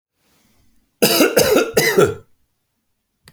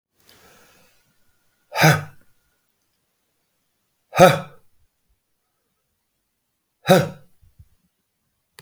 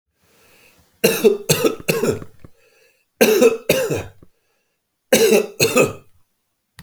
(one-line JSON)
{"cough_length": "3.3 s", "cough_amplitude": 31368, "cough_signal_mean_std_ratio": 0.45, "exhalation_length": "8.6 s", "exhalation_amplitude": 28884, "exhalation_signal_mean_std_ratio": 0.21, "three_cough_length": "6.8 s", "three_cough_amplitude": 31327, "three_cough_signal_mean_std_ratio": 0.46, "survey_phase": "beta (2021-08-13 to 2022-03-07)", "age": "65+", "gender": "Male", "wearing_mask": "No", "symptom_runny_or_blocked_nose": true, "symptom_onset": "6 days", "smoker_status": "Never smoked", "respiratory_condition_asthma": false, "respiratory_condition_other": false, "recruitment_source": "REACT", "submission_delay": "1 day", "covid_test_result": "Negative", "covid_test_method": "RT-qPCR"}